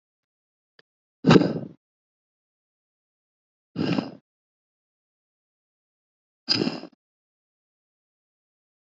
{"exhalation_length": "8.9 s", "exhalation_amplitude": 26907, "exhalation_signal_mean_std_ratio": 0.2, "survey_phase": "beta (2021-08-13 to 2022-03-07)", "age": "18-44", "gender": "Male", "wearing_mask": "No", "symptom_change_to_sense_of_smell_or_taste": true, "smoker_status": "Never smoked", "respiratory_condition_asthma": false, "respiratory_condition_other": false, "recruitment_source": "REACT", "submission_delay": "2 days", "covid_test_result": "Negative", "covid_test_method": "RT-qPCR"}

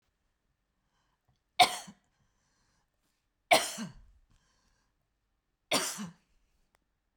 {"three_cough_length": "7.2 s", "three_cough_amplitude": 13718, "three_cough_signal_mean_std_ratio": 0.21, "survey_phase": "beta (2021-08-13 to 2022-03-07)", "age": "65+", "gender": "Female", "wearing_mask": "No", "symptom_none": true, "smoker_status": "Ex-smoker", "respiratory_condition_asthma": false, "respiratory_condition_other": false, "recruitment_source": "REACT", "submission_delay": "2 days", "covid_test_result": "Negative", "covid_test_method": "RT-qPCR"}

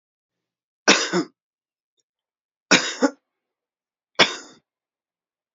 {"three_cough_length": "5.5 s", "three_cough_amplitude": 30341, "three_cough_signal_mean_std_ratio": 0.26, "survey_phase": "beta (2021-08-13 to 2022-03-07)", "age": "65+", "gender": "Male", "wearing_mask": "No", "symptom_none": true, "smoker_status": "Never smoked", "respiratory_condition_asthma": false, "respiratory_condition_other": false, "recruitment_source": "REACT", "submission_delay": "2 days", "covid_test_result": "Negative", "covid_test_method": "RT-qPCR", "influenza_a_test_result": "Negative", "influenza_b_test_result": "Negative"}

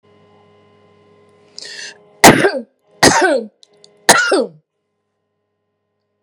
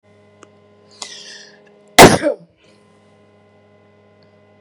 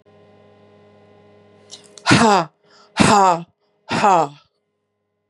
{"three_cough_length": "6.2 s", "three_cough_amplitude": 32768, "three_cough_signal_mean_std_ratio": 0.33, "cough_length": "4.6 s", "cough_amplitude": 32768, "cough_signal_mean_std_ratio": 0.21, "exhalation_length": "5.3 s", "exhalation_amplitude": 32768, "exhalation_signal_mean_std_ratio": 0.38, "survey_phase": "beta (2021-08-13 to 2022-03-07)", "age": "45-64", "gender": "Female", "wearing_mask": "No", "symptom_none": true, "smoker_status": "Ex-smoker", "respiratory_condition_asthma": false, "respiratory_condition_other": false, "recruitment_source": "REACT", "submission_delay": "1 day", "covid_test_result": "Negative", "covid_test_method": "RT-qPCR"}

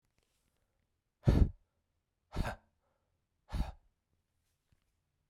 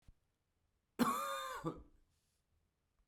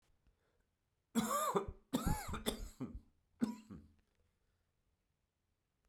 {"exhalation_length": "5.3 s", "exhalation_amplitude": 6022, "exhalation_signal_mean_std_ratio": 0.22, "cough_length": "3.1 s", "cough_amplitude": 2989, "cough_signal_mean_std_ratio": 0.37, "three_cough_length": "5.9 s", "three_cough_amplitude": 2674, "three_cough_signal_mean_std_ratio": 0.39, "survey_phase": "beta (2021-08-13 to 2022-03-07)", "age": "45-64", "gender": "Male", "wearing_mask": "No", "symptom_cough_any": true, "symptom_new_continuous_cough": true, "symptom_runny_or_blocked_nose": true, "symptom_shortness_of_breath": true, "symptom_sore_throat": true, "symptom_fatigue": true, "symptom_headache": true, "symptom_change_to_sense_of_smell_or_taste": true, "symptom_loss_of_taste": true, "symptom_other": true, "smoker_status": "Ex-smoker", "respiratory_condition_asthma": false, "respiratory_condition_other": false, "recruitment_source": "Test and Trace", "submission_delay": "2 days", "covid_test_result": "Positive", "covid_test_method": "RT-qPCR", "covid_ct_value": 20.0, "covid_ct_gene": "ORF1ab gene"}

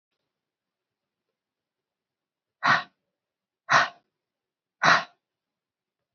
{"exhalation_length": "6.1 s", "exhalation_amplitude": 26293, "exhalation_signal_mean_std_ratio": 0.23, "survey_phase": "beta (2021-08-13 to 2022-03-07)", "age": "18-44", "gender": "Female", "wearing_mask": "No", "symptom_cough_any": true, "symptom_runny_or_blocked_nose": true, "symptom_fatigue": true, "symptom_headache": true, "symptom_onset": "5 days", "smoker_status": "Never smoked", "respiratory_condition_asthma": false, "respiratory_condition_other": false, "recruitment_source": "Test and Trace", "submission_delay": "2 days", "covid_test_result": "Positive", "covid_test_method": "RT-qPCR", "covid_ct_value": 16.5, "covid_ct_gene": "ORF1ab gene", "covid_ct_mean": 16.8, "covid_viral_load": "3100000 copies/ml", "covid_viral_load_category": "High viral load (>1M copies/ml)"}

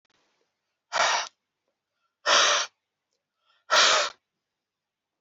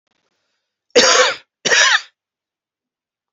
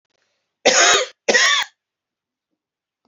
{"exhalation_length": "5.2 s", "exhalation_amplitude": 15583, "exhalation_signal_mean_std_ratio": 0.37, "cough_length": "3.3 s", "cough_amplitude": 31728, "cough_signal_mean_std_ratio": 0.38, "three_cough_length": "3.1 s", "three_cough_amplitude": 31202, "three_cough_signal_mean_std_ratio": 0.41, "survey_phase": "beta (2021-08-13 to 2022-03-07)", "age": "45-64", "gender": "Male", "wearing_mask": "No", "symptom_none": true, "smoker_status": "Ex-smoker", "respiratory_condition_asthma": false, "respiratory_condition_other": false, "recruitment_source": "REACT", "submission_delay": "1 day", "covid_test_result": "Negative", "covid_test_method": "RT-qPCR"}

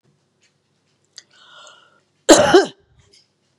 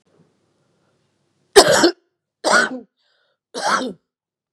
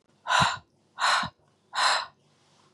{"cough_length": "3.6 s", "cough_amplitude": 32768, "cough_signal_mean_std_ratio": 0.25, "three_cough_length": "4.5 s", "three_cough_amplitude": 32768, "three_cough_signal_mean_std_ratio": 0.33, "exhalation_length": "2.7 s", "exhalation_amplitude": 12437, "exhalation_signal_mean_std_ratio": 0.47, "survey_phase": "beta (2021-08-13 to 2022-03-07)", "age": "45-64", "gender": "Female", "wearing_mask": "No", "symptom_abdominal_pain": true, "smoker_status": "Never smoked", "respiratory_condition_asthma": false, "respiratory_condition_other": false, "recruitment_source": "REACT", "submission_delay": "4 days", "covid_test_result": "Negative", "covid_test_method": "RT-qPCR", "influenza_a_test_result": "Negative", "influenza_b_test_result": "Negative"}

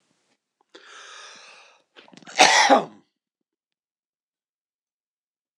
{"cough_length": "5.6 s", "cough_amplitude": 26025, "cough_signal_mean_std_ratio": 0.24, "survey_phase": "alpha (2021-03-01 to 2021-08-12)", "age": "65+", "gender": "Male", "wearing_mask": "No", "symptom_none": true, "smoker_status": "Never smoked", "respiratory_condition_asthma": false, "respiratory_condition_other": false, "recruitment_source": "REACT", "submission_delay": "1 day", "covid_test_result": "Negative", "covid_test_method": "RT-qPCR"}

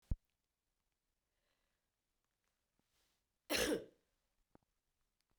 {"three_cough_length": "5.4 s", "three_cough_amplitude": 2111, "three_cough_signal_mean_std_ratio": 0.21, "survey_phase": "beta (2021-08-13 to 2022-03-07)", "age": "45-64", "gender": "Female", "wearing_mask": "No", "symptom_cough_any": true, "symptom_runny_or_blocked_nose": true, "symptom_sore_throat": true, "symptom_fatigue": true, "symptom_headache": true, "symptom_change_to_sense_of_smell_or_taste": true, "smoker_status": "Never smoked", "respiratory_condition_asthma": false, "respiratory_condition_other": false, "recruitment_source": "Test and Trace", "submission_delay": "2 days", "covid_test_result": "Positive", "covid_test_method": "RT-qPCR", "covid_ct_value": 33.1, "covid_ct_gene": "N gene"}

